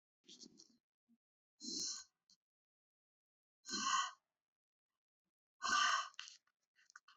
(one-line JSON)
{"exhalation_length": "7.2 s", "exhalation_amplitude": 2622, "exhalation_signal_mean_std_ratio": 0.33, "survey_phase": "beta (2021-08-13 to 2022-03-07)", "age": "18-44", "gender": "Female", "wearing_mask": "No", "symptom_none": true, "smoker_status": "Never smoked", "respiratory_condition_asthma": true, "respiratory_condition_other": false, "recruitment_source": "REACT", "submission_delay": "2 days", "covid_test_result": "Negative", "covid_test_method": "RT-qPCR"}